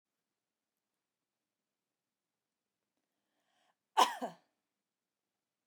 {
  "cough_length": "5.7 s",
  "cough_amplitude": 5863,
  "cough_signal_mean_std_ratio": 0.13,
  "survey_phase": "beta (2021-08-13 to 2022-03-07)",
  "age": "45-64",
  "gender": "Female",
  "wearing_mask": "No",
  "symptom_runny_or_blocked_nose": true,
  "smoker_status": "Never smoked",
  "respiratory_condition_asthma": false,
  "respiratory_condition_other": false,
  "recruitment_source": "REACT",
  "submission_delay": "2 days",
  "covid_test_result": "Negative",
  "covid_test_method": "RT-qPCR",
  "influenza_a_test_result": "Negative",
  "influenza_b_test_result": "Negative"
}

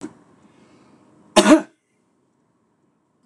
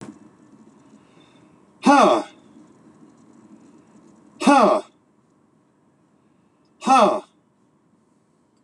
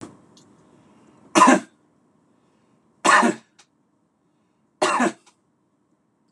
{
  "cough_length": "3.3 s",
  "cough_amplitude": 26028,
  "cough_signal_mean_std_ratio": 0.22,
  "exhalation_length": "8.6 s",
  "exhalation_amplitude": 24419,
  "exhalation_signal_mean_std_ratio": 0.31,
  "three_cough_length": "6.3 s",
  "three_cough_amplitude": 26028,
  "three_cough_signal_mean_std_ratio": 0.29,
  "survey_phase": "beta (2021-08-13 to 2022-03-07)",
  "age": "65+",
  "gender": "Male",
  "wearing_mask": "No",
  "symptom_fatigue": true,
  "smoker_status": "Ex-smoker",
  "respiratory_condition_asthma": false,
  "respiratory_condition_other": false,
  "recruitment_source": "Test and Trace",
  "submission_delay": "0 days",
  "covid_test_result": "Positive",
  "covid_test_method": "LFT"
}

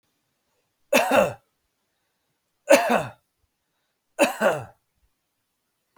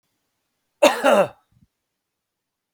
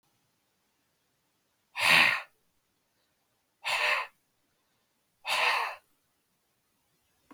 {
  "three_cough_length": "6.0 s",
  "three_cough_amplitude": 31076,
  "three_cough_signal_mean_std_ratio": 0.32,
  "cough_length": "2.7 s",
  "cough_amplitude": 32277,
  "cough_signal_mean_std_ratio": 0.29,
  "exhalation_length": "7.3 s",
  "exhalation_amplitude": 12744,
  "exhalation_signal_mean_std_ratio": 0.32,
  "survey_phase": "beta (2021-08-13 to 2022-03-07)",
  "age": "45-64",
  "gender": "Male",
  "wearing_mask": "No",
  "symptom_headache": true,
  "smoker_status": "Never smoked",
  "respiratory_condition_asthma": false,
  "respiratory_condition_other": false,
  "recruitment_source": "REACT",
  "submission_delay": "1 day",
  "covid_test_result": "Negative",
  "covid_test_method": "RT-qPCR",
  "influenza_a_test_result": "Negative",
  "influenza_b_test_result": "Negative"
}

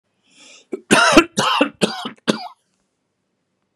{
  "cough_length": "3.8 s",
  "cough_amplitude": 32768,
  "cough_signal_mean_std_ratio": 0.37,
  "survey_phase": "beta (2021-08-13 to 2022-03-07)",
  "age": "65+",
  "gender": "Male",
  "wearing_mask": "No",
  "symptom_none": true,
  "smoker_status": "Ex-smoker",
  "respiratory_condition_asthma": false,
  "respiratory_condition_other": false,
  "recruitment_source": "REACT",
  "submission_delay": "2 days",
  "covid_test_result": "Negative",
  "covid_test_method": "RT-qPCR",
  "influenza_a_test_result": "Negative",
  "influenza_b_test_result": "Negative"
}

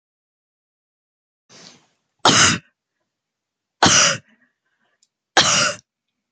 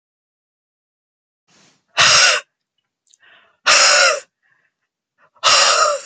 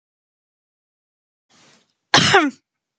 {
  "three_cough_length": "6.3 s",
  "three_cough_amplitude": 32767,
  "three_cough_signal_mean_std_ratio": 0.32,
  "exhalation_length": "6.1 s",
  "exhalation_amplitude": 32768,
  "exhalation_signal_mean_std_ratio": 0.42,
  "cough_length": "3.0 s",
  "cough_amplitude": 32767,
  "cough_signal_mean_std_ratio": 0.27,
  "survey_phase": "beta (2021-08-13 to 2022-03-07)",
  "age": "18-44",
  "gender": "Female",
  "wearing_mask": "No",
  "symptom_fatigue": true,
  "smoker_status": "Ex-smoker",
  "respiratory_condition_asthma": false,
  "respiratory_condition_other": false,
  "recruitment_source": "REACT",
  "submission_delay": "2 days",
  "covid_test_result": "Negative",
  "covid_test_method": "RT-qPCR"
}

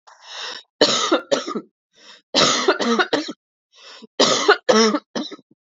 {
  "three_cough_length": "5.6 s",
  "three_cough_amplitude": 27754,
  "three_cough_signal_mean_std_ratio": 0.51,
  "survey_phase": "beta (2021-08-13 to 2022-03-07)",
  "age": "18-44",
  "gender": "Female",
  "wearing_mask": "Yes",
  "symptom_none": true,
  "smoker_status": "Ex-smoker",
  "respiratory_condition_asthma": true,
  "respiratory_condition_other": false,
  "recruitment_source": "REACT",
  "submission_delay": "1 day",
  "covid_test_result": "Negative",
  "covid_test_method": "RT-qPCR"
}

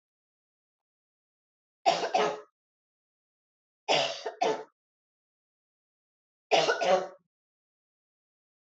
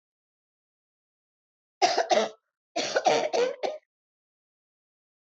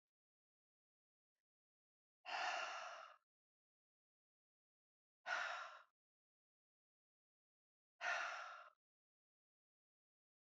{
  "three_cough_length": "8.6 s",
  "three_cough_amplitude": 9733,
  "three_cough_signal_mean_std_ratio": 0.32,
  "cough_length": "5.4 s",
  "cough_amplitude": 11378,
  "cough_signal_mean_std_ratio": 0.37,
  "exhalation_length": "10.4 s",
  "exhalation_amplitude": 921,
  "exhalation_signal_mean_std_ratio": 0.33,
  "survey_phase": "beta (2021-08-13 to 2022-03-07)",
  "age": "65+",
  "gender": "Female",
  "wearing_mask": "No",
  "symptom_none": true,
  "smoker_status": "Never smoked",
  "respiratory_condition_asthma": false,
  "respiratory_condition_other": false,
  "recruitment_source": "REACT",
  "submission_delay": "1 day",
  "covid_test_result": "Negative",
  "covid_test_method": "RT-qPCR"
}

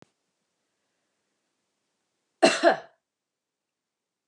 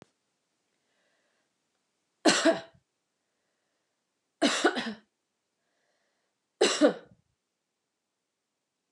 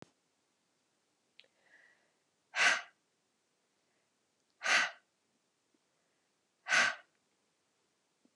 {
  "cough_length": "4.3 s",
  "cough_amplitude": 20349,
  "cough_signal_mean_std_ratio": 0.19,
  "three_cough_length": "8.9 s",
  "three_cough_amplitude": 15702,
  "three_cough_signal_mean_std_ratio": 0.26,
  "exhalation_length": "8.4 s",
  "exhalation_amplitude": 5701,
  "exhalation_signal_mean_std_ratio": 0.24,
  "survey_phase": "alpha (2021-03-01 to 2021-08-12)",
  "age": "45-64",
  "gender": "Female",
  "wearing_mask": "No",
  "symptom_none": true,
  "smoker_status": "Ex-smoker",
  "respiratory_condition_asthma": false,
  "respiratory_condition_other": false,
  "recruitment_source": "REACT",
  "submission_delay": "2 days",
  "covid_test_result": "Negative",
  "covid_test_method": "RT-qPCR"
}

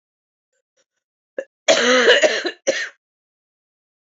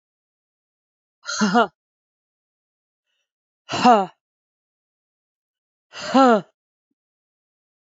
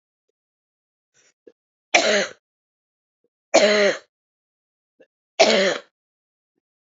{
  "cough_length": "4.0 s",
  "cough_amplitude": 28241,
  "cough_signal_mean_std_ratio": 0.38,
  "exhalation_length": "7.9 s",
  "exhalation_amplitude": 26796,
  "exhalation_signal_mean_std_ratio": 0.25,
  "three_cough_length": "6.8 s",
  "three_cough_amplitude": 29642,
  "three_cough_signal_mean_std_ratio": 0.32,
  "survey_phase": "beta (2021-08-13 to 2022-03-07)",
  "age": "45-64",
  "gender": "Female",
  "wearing_mask": "No",
  "symptom_cough_any": true,
  "symptom_runny_or_blocked_nose": true,
  "symptom_shortness_of_breath": true,
  "symptom_sore_throat": true,
  "symptom_fatigue": true,
  "symptom_fever_high_temperature": true,
  "symptom_headache": true,
  "symptom_onset": "4 days",
  "smoker_status": "Never smoked",
  "respiratory_condition_asthma": false,
  "respiratory_condition_other": false,
  "recruitment_source": "Test and Trace",
  "submission_delay": "2 days",
  "covid_test_result": "Negative",
  "covid_test_method": "ePCR"
}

